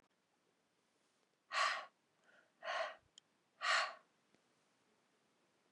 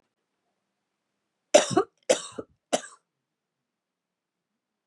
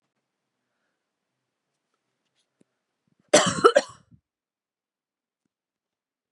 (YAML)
exhalation_length: 5.7 s
exhalation_amplitude: 2530
exhalation_signal_mean_std_ratio: 0.32
three_cough_length: 4.9 s
three_cough_amplitude: 23785
three_cough_signal_mean_std_ratio: 0.2
cough_length: 6.3 s
cough_amplitude: 25707
cough_signal_mean_std_ratio: 0.17
survey_phase: beta (2021-08-13 to 2022-03-07)
age: 45-64
gender: Female
wearing_mask: 'No'
symptom_cough_any: true
symptom_runny_or_blocked_nose: true
symptom_abdominal_pain: true
symptom_diarrhoea: true
symptom_fatigue: true
symptom_fever_high_temperature: true
symptom_headache: true
symptom_change_to_sense_of_smell_or_taste: true
symptom_loss_of_taste: true
smoker_status: Never smoked
respiratory_condition_asthma: false
respiratory_condition_other: false
recruitment_source: Test and Trace
submission_delay: 1 day
covid_test_result: Positive
covid_test_method: LFT